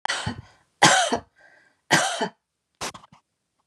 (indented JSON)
{
  "three_cough_length": "3.7 s",
  "three_cough_amplitude": 32712,
  "three_cough_signal_mean_std_ratio": 0.38,
  "survey_phase": "beta (2021-08-13 to 2022-03-07)",
  "age": "65+",
  "gender": "Female",
  "wearing_mask": "No",
  "symptom_none": true,
  "smoker_status": "Ex-smoker",
  "respiratory_condition_asthma": false,
  "respiratory_condition_other": true,
  "recruitment_source": "REACT",
  "submission_delay": "1 day",
  "covid_test_result": "Negative",
  "covid_test_method": "RT-qPCR",
  "influenza_a_test_result": "Negative",
  "influenza_b_test_result": "Negative"
}